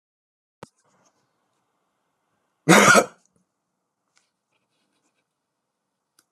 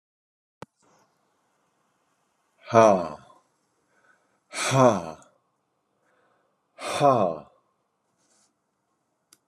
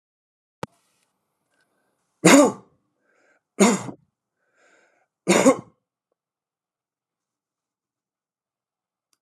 {
  "cough_length": "6.3 s",
  "cough_amplitude": 30465,
  "cough_signal_mean_std_ratio": 0.19,
  "exhalation_length": "9.5 s",
  "exhalation_amplitude": 25077,
  "exhalation_signal_mean_std_ratio": 0.27,
  "three_cough_length": "9.2 s",
  "three_cough_amplitude": 32037,
  "three_cough_signal_mean_std_ratio": 0.22,
  "survey_phase": "beta (2021-08-13 to 2022-03-07)",
  "age": "65+",
  "gender": "Male",
  "wearing_mask": "No",
  "symptom_none": true,
  "smoker_status": "Never smoked",
  "respiratory_condition_asthma": false,
  "respiratory_condition_other": false,
  "recruitment_source": "REACT",
  "submission_delay": "0 days",
  "covid_test_result": "Negative",
  "covid_test_method": "RT-qPCR"
}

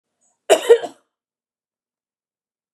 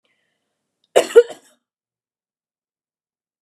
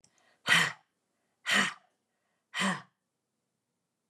{
  "cough_length": "2.7 s",
  "cough_amplitude": 31854,
  "cough_signal_mean_std_ratio": 0.22,
  "three_cough_length": "3.4 s",
  "three_cough_amplitude": 32768,
  "three_cough_signal_mean_std_ratio": 0.16,
  "exhalation_length": "4.1 s",
  "exhalation_amplitude": 10735,
  "exhalation_signal_mean_std_ratio": 0.32,
  "survey_phase": "beta (2021-08-13 to 2022-03-07)",
  "age": "65+",
  "gender": "Female",
  "wearing_mask": "No",
  "symptom_none": true,
  "smoker_status": "Never smoked",
  "respiratory_condition_asthma": false,
  "respiratory_condition_other": false,
  "recruitment_source": "Test and Trace",
  "submission_delay": "1 day",
  "covid_test_result": "Positive",
  "covid_test_method": "RT-qPCR",
  "covid_ct_value": 32.4,
  "covid_ct_gene": "ORF1ab gene"
}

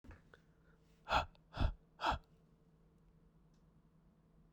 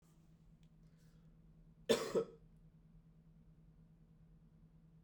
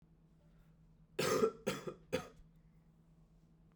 {
  "exhalation_length": "4.5 s",
  "exhalation_amplitude": 3365,
  "exhalation_signal_mean_std_ratio": 0.3,
  "cough_length": "5.0 s",
  "cough_amplitude": 3660,
  "cough_signal_mean_std_ratio": 0.28,
  "three_cough_length": "3.8 s",
  "three_cough_amplitude": 3497,
  "three_cough_signal_mean_std_ratio": 0.36,
  "survey_phase": "beta (2021-08-13 to 2022-03-07)",
  "age": "18-44",
  "gender": "Male",
  "wearing_mask": "No",
  "symptom_new_continuous_cough": true,
  "symptom_runny_or_blocked_nose": true,
  "symptom_sore_throat": true,
  "symptom_fatigue": true,
  "symptom_change_to_sense_of_smell_or_taste": true,
  "symptom_onset": "2 days",
  "smoker_status": "Current smoker (e-cigarettes or vapes only)",
  "respiratory_condition_asthma": false,
  "respiratory_condition_other": false,
  "recruitment_source": "Test and Trace",
  "submission_delay": "1 day",
  "covid_test_result": "Negative",
  "covid_test_method": "RT-qPCR"
}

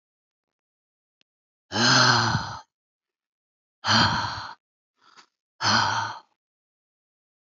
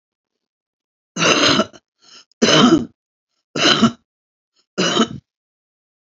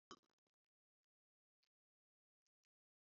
{
  "exhalation_length": "7.4 s",
  "exhalation_amplitude": 19247,
  "exhalation_signal_mean_std_ratio": 0.39,
  "three_cough_length": "6.1 s",
  "three_cough_amplitude": 31514,
  "three_cough_signal_mean_std_ratio": 0.4,
  "cough_length": "3.2 s",
  "cough_amplitude": 173,
  "cough_signal_mean_std_ratio": 0.09,
  "survey_phase": "alpha (2021-03-01 to 2021-08-12)",
  "age": "65+",
  "gender": "Female",
  "wearing_mask": "No",
  "symptom_none": true,
  "smoker_status": "Current smoker (11 or more cigarettes per day)",
  "respiratory_condition_asthma": false,
  "respiratory_condition_other": true,
  "recruitment_source": "REACT",
  "submission_delay": "1 day",
  "covid_test_result": "Negative",
  "covid_test_method": "RT-qPCR"
}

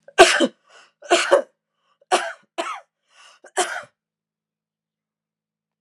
{
  "three_cough_length": "5.8 s",
  "three_cough_amplitude": 32767,
  "three_cough_signal_mean_std_ratio": 0.29,
  "survey_phase": "alpha (2021-03-01 to 2021-08-12)",
  "age": "45-64",
  "gender": "Female",
  "wearing_mask": "No",
  "symptom_cough_any": true,
  "symptom_fatigue": true,
  "smoker_status": "Never smoked",
  "respiratory_condition_asthma": false,
  "respiratory_condition_other": false,
  "recruitment_source": "Test and Trace",
  "submission_delay": "2 days",
  "covid_ct_value": 22.9,
  "covid_ct_gene": "ORF1ab gene"
}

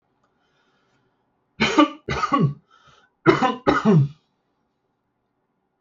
{
  "cough_length": "5.8 s",
  "cough_amplitude": 27442,
  "cough_signal_mean_std_ratio": 0.38,
  "survey_phase": "alpha (2021-03-01 to 2021-08-12)",
  "age": "45-64",
  "gender": "Male",
  "wearing_mask": "No",
  "symptom_fatigue": true,
  "smoker_status": "Ex-smoker",
  "respiratory_condition_asthma": false,
  "respiratory_condition_other": false,
  "recruitment_source": "REACT",
  "submission_delay": "2 days",
  "covid_test_result": "Negative",
  "covid_test_method": "RT-qPCR"
}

